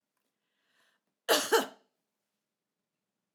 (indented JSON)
{
  "cough_length": "3.3 s",
  "cough_amplitude": 8234,
  "cough_signal_mean_std_ratio": 0.23,
  "survey_phase": "alpha (2021-03-01 to 2021-08-12)",
  "age": "65+",
  "gender": "Female",
  "wearing_mask": "No",
  "symptom_none": true,
  "smoker_status": "Never smoked",
  "respiratory_condition_asthma": false,
  "respiratory_condition_other": false,
  "recruitment_source": "REACT",
  "submission_delay": "1 day",
  "covid_test_result": "Negative",
  "covid_test_method": "RT-qPCR"
}